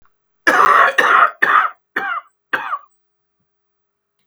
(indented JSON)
{
  "cough_length": "4.3 s",
  "cough_amplitude": 32768,
  "cough_signal_mean_std_ratio": 0.47,
  "survey_phase": "beta (2021-08-13 to 2022-03-07)",
  "age": "65+",
  "gender": "Female",
  "wearing_mask": "No",
  "symptom_cough_any": true,
  "symptom_runny_or_blocked_nose": true,
  "symptom_sore_throat": true,
  "symptom_fatigue": true,
  "symptom_headache": true,
  "smoker_status": "Never smoked",
  "respiratory_condition_asthma": false,
  "respiratory_condition_other": false,
  "recruitment_source": "Test and Trace",
  "submission_delay": "1 day",
  "covid_test_result": "Negative",
  "covid_test_method": "ePCR"
}